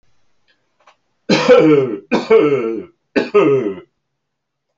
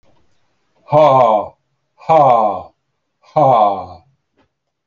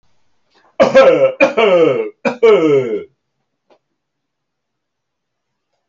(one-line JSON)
{"three_cough_length": "4.8 s", "three_cough_amplitude": 28396, "three_cough_signal_mean_std_ratio": 0.51, "exhalation_length": "4.9 s", "exhalation_amplitude": 27574, "exhalation_signal_mean_std_ratio": 0.48, "cough_length": "5.9 s", "cough_amplitude": 28786, "cough_signal_mean_std_ratio": 0.47, "survey_phase": "beta (2021-08-13 to 2022-03-07)", "age": "65+", "gender": "Male", "wearing_mask": "No", "symptom_headache": true, "smoker_status": "Never smoked", "respiratory_condition_asthma": false, "respiratory_condition_other": false, "recruitment_source": "REACT", "submission_delay": "1 day", "covid_test_result": "Negative", "covid_test_method": "RT-qPCR"}